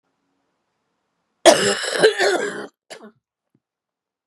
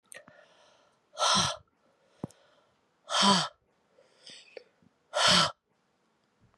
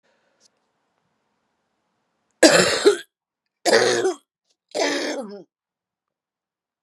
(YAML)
cough_length: 4.3 s
cough_amplitude: 32768
cough_signal_mean_std_ratio: 0.34
exhalation_length: 6.6 s
exhalation_amplitude: 9927
exhalation_signal_mean_std_ratio: 0.34
three_cough_length: 6.8 s
three_cough_amplitude: 32767
three_cough_signal_mean_std_ratio: 0.34
survey_phase: beta (2021-08-13 to 2022-03-07)
age: 45-64
gender: Female
wearing_mask: 'No'
symptom_cough_any: true
symptom_runny_or_blocked_nose: true
symptom_fatigue: true
symptom_headache: true
symptom_onset: 3 days
smoker_status: Never smoked
respiratory_condition_asthma: false
respiratory_condition_other: false
recruitment_source: Test and Trace
submission_delay: 1 day
covid_test_result: Positive
covid_test_method: RT-qPCR
covid_ct_value: 22.9
covid_ct_gene: ORF1ab gene